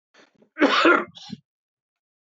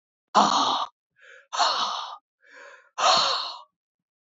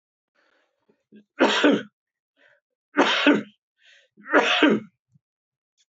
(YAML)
cough_length: 2.2 s
cough_amplitude: 20758
cough_signal_mean_std_ratio: 0.36
exhalation_length: 4.4 s
exhalation_amplitude: 20823
exhalation_signal_mean_std_ratio: 0.48
three_cough_length: 6.0 s
three_cough_amplitude: 21461
three_cough_signal_mean_std_ratio: 0.38
survey_phase: beta (2021-08-13 to 2022-03-07)
age: 65+
gender: Male
wearing_mask: 'No'
symptom_cough_any: true
smoker_status: Ex-smoker
respiratory_condition_asthma: false
respiratory_condition_other: false
recruitment_source: REACT
submission_delay: 1 day
covid_test_result: Negative
covid_test_method: RT-qPCR
influenza_a_test_result: Negative
influenza_b_test_result: Negative